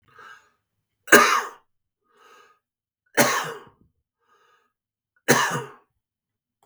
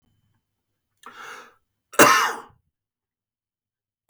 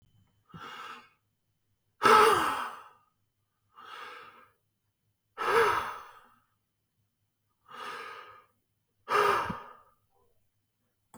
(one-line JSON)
{"three_cough_length": "6.7 s", "three_cough_amplitude": 32768, "three_cough_signal_mean_std_ratio": 0.27, "cough_length": "4.1 s", "cough_amplitude": 32768, "cough_signal_mean_std_ratio": 0.23, "exhalation_length": "11.2 s", "exhalation_amplitude": 11962, "exhalation_signal_mean_std_ratio": 0.32, "survey_phase": "beta (2021-08-13 to 2022-03-07)", "age": "45-64", "gender": "Male", "wearing_mask": "No", "symptom_none": true, "smoker_status": "Never smoked", "respiratory_condition_asthma": false, "respiratory_condition_other": false, "recruitment_source": "REACT", "submission_delay": "2 days", "covid_test_result": "Negative", "covid_test_method": "RT-qPCR", "influenza_a_test_result": "Unknown/Void", "influenza_b_test_result": "Unknown/Void"}